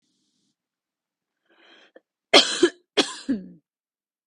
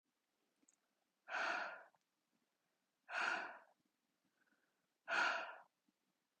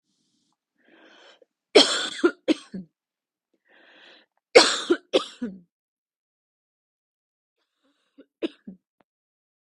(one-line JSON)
{"cough_length": "4.3 s", "cough_amplitude": 32768, "cough_signal_mean_std_ratio": 0.25, "exhalation_length": "6.4 s", "exhalation_amplitude": 1532, "exhalation_signal_mean_std_ratio": 0.37, "three_cough_length": "9.7 s", "three_cough_amplitude": 32768, "three_cough_signal_mean_std_ratio": 0.22, "survey_phase": "beta (2021-08-13 to 2022-03-07)", "age": "18-44", "gender": "Female", "wearing_mask": "No", "symptom_none": true, "smoker_status": "Never smoked", "respiratory_condition_asthma": false, "respiratory_condition_other": false, "recruitment_source": "REACT", "submission_delay": "1 day", "covid_test_result": "Negative", "covid_test_method": "RT-qPCR", "influenza_a_test_result": "Negative", "influenza_b_test_result": "Negative"}